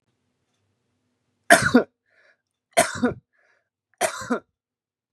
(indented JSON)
{
  "three_cough_length": "5.1 s",
  "three_cough_amplitude": 32341,
  "three_cough_signal_mean_std_ratio": 0.27,
  "survey_phase": "beta (2021-08-13 to 2022-03-07)",
  "age": "45-64",
  "gender": "Male",
  "wearing_mask": "No",
  "symptom_none": true,
  "smoker_status": "Ex-smoker",
  "respiratory_condition_asthma": false,
  "respiratory_condition_other": false,
  "recruitment_source": "REACT",
  "submission_delay": "2 days",
  "covid_test_result": "Negative",
  "covid_test_method": "RT-qPCR"
}